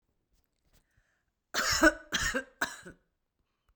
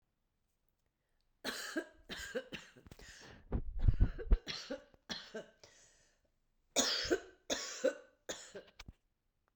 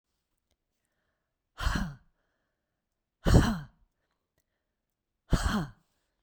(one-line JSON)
{"cough_length": "3.8 s", "cough_amplitude": 11848, "cough_signal_mean_std_ratio": 0.32, "three_cough_length": "9.6 s", "three_cough_amplitude": 5212, "three_cough_signal_mean_std_ratio": 0.37, "exhalation_length": "6.2 s", "exhalation_amplitude": 13829, "exhalation_signal_mean_std_ratio": 0.28, "survey_phase": "beta (2021-08-13 to 2022-03-07)", "age": "45-64", "gender": "Female", "wearing_mask": "No", "symptom_none": true, "smoker_status": "Ex-smoker", "respiratory_condition_asthma": false, "respiratory_condition_other": false, "recruitment_source": "REACT", "submission_delay": "2 days", "covid_test_result": "Negative", "covid_test_method": "RT-qPCR", "influenza_a_test_result": "Negative", "influenza_b_test_result": "Negative"}